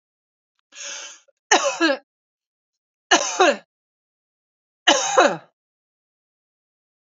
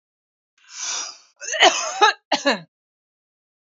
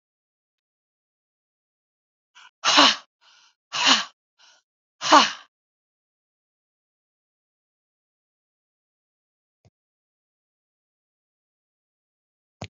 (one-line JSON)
{"three_cough_length": "7.1 s", "three_cough_amplitude": 32767, "three_cough_signal_mean_std_ratio": 0.31, "cough_length": "3.7 s", "cough_amplitude": 30874, "cough_signal_mean_std_ratio": 0.37, "exhalation_length": "12.7 s", "exhalation_amplitude": 30526, "exhalation_signal_mean_std_ratio": 0.19, "survey_phase": "beta (2021-08-13 to 2022-03-07)", "age": "45-64", "gender": "Female", "wearing_mask": "No", "symptom_none": true, "smoker_status": "Never smoked", "respiratory_condition_asthma": false, "respiratory_condition_other": false, "recruitment_source": "REACT", "submission_delay": "2 days", "covid_test_result": "Negative", "covid_test_method": "RT-qPCR", "influenza_a_test_result": "Negative", "influenza_b_test_result": "Negative"}